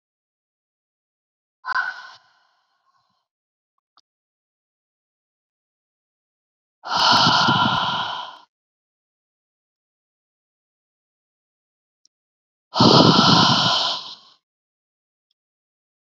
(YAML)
exhalation_length: 16.0 s
exhalation_amplitude: 30049
exhalation_signal_mean_std_ratio: 0.32
survey_phase: beta (2021-08-13 to 2022-03-07)
age: 45-64
gender: Female
wearing_mask: 'No'
symptom_cough_any: true
symptom_runny_or_blocked_nose: true
symptom_sore_throat: true
symptom_fatigue: true
symptom_onset: 2 days
smoker_status: Never smoked
respiratory_condition_asthma: false
respiratory_condition_other: false
recruitment_source: Test and Trace
submission_delay: 0 days
covid_test_result: Positive
covid_test_method: ePCR